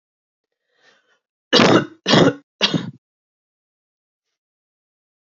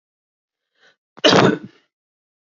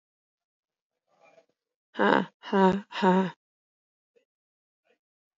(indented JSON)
{
  "three_cough_length": "5.2 s",
  "three_cough_amplitude": 32768,
  "three_cough_signal_mean_std_ratio": 0.3,
  "cough_length": "2.6 s",
  "cough_amplitude": 29456,
  "cough_signal_mean_std_ratio": 0.28,
  "exhalation_length": "5.4 s",
  "exhalation_amplitude": 19335,
  "exhalation_signal_mean_std_ratio": 0.32,
  "survey_phase": "alpha (2021-03-01 to 2021-08-12)",
  "age": "18-44",
  "gender": "Female",
  "wearing_mask": "No",
  "symptom_cough_any": true,
  "symptom_new_continuous_cough": true,
  "symptom_shortness_of_breath": true,
  "symptom_abdominal_pain": true,
  "symptom_fever_high_temperature": true,
  "symptom_headache": true,
  "smoker_status": "Never smoked",
  "respiratory_condition_asthma": true,
  "respiratory_condition_other": false,
  "recruitment_source": "Test and Trace",
  "submission_delay": "2 days",
  "covid_test_result": "Positive",
  "covid_test_method": "RT-qPCR",
  "covid_ct_value": 14.8,
  "covid_ct_gene": "ORF1ab gene",
  "covid_ct_mean": 15.5,
  "covid_viral_load": "8000000 copies/ml",
  "covid_viral_load_category": "High viral load (>1M copies/ml)"
}